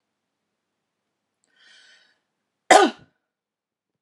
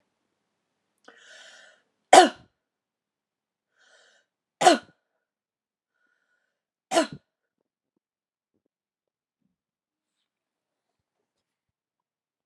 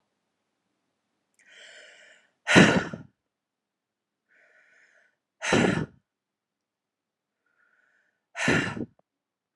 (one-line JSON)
{"cough_length": "4.0 s", "cough_amplitude": 30724, "cough_signal_mean_std_ratio": 0.17, "three_cough_length": "12.5 s", "three_cough_amplitude": 32679, "three_cough_signal_mean_std_ratio": 0.14, "exhalation_length": "9.6 s", "exhalation_amplitude": 26792, "exhalation_signal_mean_std_ratio": 0.25, "survey_phase": "beta (2021-08-13 to 2022-03-07)", "age": "18-44", "gender": "Female", "wearing_mask": "No", "symptom_headache": true, "smoker_status": "Never smoked", "respiratory_condition_asthma": false, "respiratory_condition_other": false, "recruitment_source": "REACT", "submission_delay": "1 day", "covid_test_result": "Negative", "covid_test_method": "RT-qPCR"}